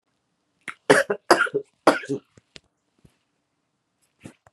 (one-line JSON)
{"three_cough_length": "4.5 s", "three_cough_amplitude": 32767, "three_cough_signal_mean_std_ratio": 0.26, "survey_phase": "beta (2021-08-13 to 2022-03-07)", "age": "45-64", "gender": "Female", "wearing_mask": "No", "symptom_none": true, "smoker_status": "Current smoker (1 to 10 cigarettes per day)", "respiratory_condition_asthma": false, "respiratory_condition_other": false, "recruitment_source": "REACT", "submission_delay": "3 days", "covid_test_result": "Negative", "covid_test_method": "RT-qPCR"}